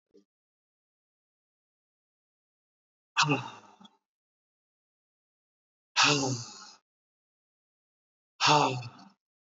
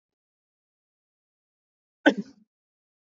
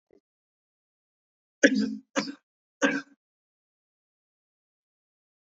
{"exhalation_length": "9.6 s", "exhalation_amplitude": 10375, "exhalation_signal_mean_std_ratio": 0.27, "cough_length": "3.2 s", "cough_amplitude": 20507, "cough_signal_mean_std_ratio": 0.13, "three_cough_length": "5.5 s", "three_cough_amplitude": 25350, "three_cough_signal_mean_std_ratio": 0.23, "survey_phase": "beta (2021-08-13 to 2022-03-07)", "age": "18-44", "gender": "Male", "wearing_mask": "No", "symptom_none": true, "smoker_status": "Ex-smoker", "respiratory_condition_asthma": false, "respiratory_condition_other": false, "recruitment_source": "REACT", "submission_delay": "3 days", "covid_test_result": "Negative", "covid_test_method": "RT-qPCR", "influenza_a_test_result": "Negative", "influenza_b_test_result": "Negative"}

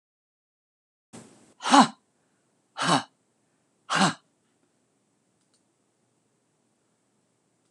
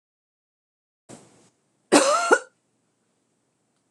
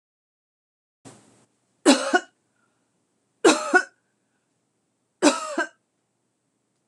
{"exhalation_length": "7.7 s", "exhalation_amplitude": 23707, "exhalation_signal_mean_std_ratio": 0.21, "cough_length": "3.9 s", "cough_amplitude": 26027, "cough_signal_mean_std_ratio": 0.26, "three_cough_length": "6.9 s", "three_cough_amplitude": 25513, "three_cough_signal_mean_std_ratio": 0.26, "survey_phase": "beta (2021-08-13 to 2022-03-07)", "age": "45-64", "gender": "Female", "wearing_mask": "No", "symptom_none": true, "smoker_status": "Never smoked", "respiratory_condition_asthma": false, "respiratory_condition_other": false, "recruitment_source": "REACT", "submission_delay": "5 days", "covid_test_result": "Negative", "covid_test_method": "RT-qPCR"}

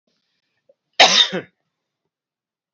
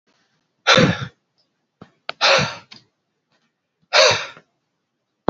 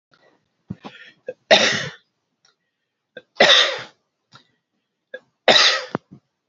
{"cough_length": "2.7 s", "cough_amplitude": 31106, "cough_signal_mean_std_ratio": 0.26, "exhalation_length": "5.3 s", "exhalation_amplitude": 30041, "exhalation_signal_mean_std_ratio": 0.33, "three_cough_length": "6.5 s", "three_cough_amplitude": 31097, "three_cough_signal_mean_std_ratio": 0.32, "survey_phase": "alpha (2021-03-01 to 2021-08-12)", "age": "45-64", "gender": "Male", "wearing_mask": "No", "symptom_cough_any": true, "symptom_shortness_of_breath": true, "symptom_fatigue": true, "symptom_change_to_sense_of_smell_or_taste": true, "symptom_loss_of_taste": true, "smoker_status": "Never smoked", "respiratory_condition_asthma": false, "respiratory_condition_other": false, "recruitment_source": "Test and Trace", "submission_delay": "2 days", "covid_test_result": "Positive", "covid_test_method": "RT-qPCR", "covid_ct_value": 16.8, "covid_ct_gene": "ORF1ab gene", "covid_ct_mean": 17.0, "covid_viral_load": "2600000 copies/ml", "covid_viral_load_category": "High viral load (>1M copies/ml)"}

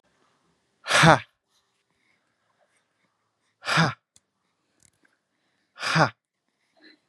{"exhalation_length": "7.1 s", "exhalation_amplitude": 32671, "exhalation_signal_mean_std_ratio": 0.23, "survey_phase": "beta (2021-08-13 to 2022-03-07)", "age": "18-44", "gender": "Male", "wearing_mask": "No", "symptom_none": true, "smoker_status": "Never smoked", "respiratory_condition_asthma": false, "respiratory_condition_other": false, "recruitment_source": "REACT", "submission_delay": "1 day", "covid_test_result": "Negative", "covid_test_method": "RT-qPCR", "influenza_a_test_result": "Negative", "influenza_b_test_result": "Negative"}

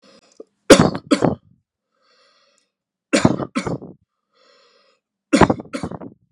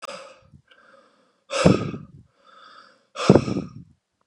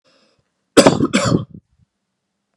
{"three_cough_length": "6.3 s", "three_cough_amplitude": 32768, "three_cough_signal_mean_std_ratio": 0.29, "exhalation_length": "4.3 s", "exhalation_amplitude": 32768, "exhalation_signal_mean_std_ratio": 0.3, "cough_length": "2.6 s", "cough_amplitude": 32768, "cough_signal_mean_std_ratio": 0.34, "survey_phase": "beta (2021-08-13 to 2022-03-07)", "age": "18-44", "gender": "Male", "wearing_mask": "No", "symptom_abdominal_pain": true, "symptom_diarrhoea": true, "smoker_status": "Never smoked", "respiratory_condition_asthma": false, "respiratory_condition_other": false, "recruitment_source": "REACT", "submission_delay": "1 day", "covid_test_result": "Negative", "covid_test_method": "RT-qPCR"}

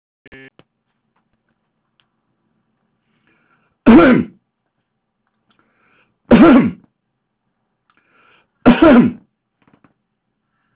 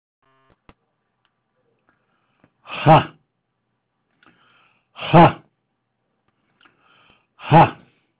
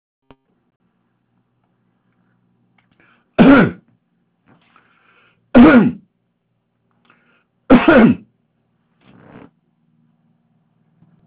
{"cough_length": "10.8 s", "cough_amplitude": 30099, "cough_signal_mean_std_ratio": 0.28, "exhalation_length": "8.2 s", "exhalation_amplitude": 29560, "exhalation_signal_mean_std_ratio": 0.22, "three_cough_length": "11.3 s", "three_cough_amplitude": 30109, "three_cough_signal_mean_std_ratio": 0.26, "survey_phase": "beta (2021-08-13 to 2022-03-07)", "age": "65+", "gender": "Male", "wearing_mask": "No", "symptom_shortness_of_breath": true, "symptom_fatigue": true, "smoker_status": "Ex-smoker", "respiratory_condition_asthma": false, "respiratory_condition_other": false, "recruitment_source": "REACT", "submission_delay": "1 day", "covid_test_result": "Negative", "covid_test_method": "RT-qPCR"}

